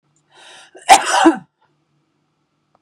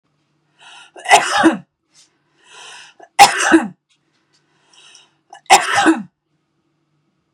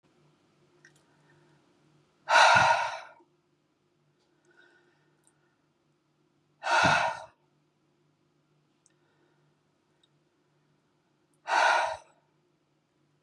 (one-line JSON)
{"cough_length": "2.8 s", "cough_amplitude": 32768, "cough_signal_mean_std_ratio": 0.29, "three_cough_length": "7.3 s", "three_cough_amplitude": 32768, "three_cough_signal_mean_std_ratio": 0.33, "exhalation_length": "13.2 s", "exhalation_amplitude": 13441, "exhalation_signal_mean_std_ratio": 0.28, "survey_phase": "beta (2021-08-13 to 2022-03-07)", "age": "45-64", "gender": "Female", "wearing_mask": "No", "symptom_none": true, "smoker_status": "Ex-smoker", "respiratory_condition_asthma": false, "respiratory_condition_other": false, "recruitment_source": "REACT", "submission_delay": "3 days", "covid_test_result": "Negative", "covid_test_method": "RT-qPCR", "influenza_a_test_result": "Negative", "influenza_b_test_result": "Negative"}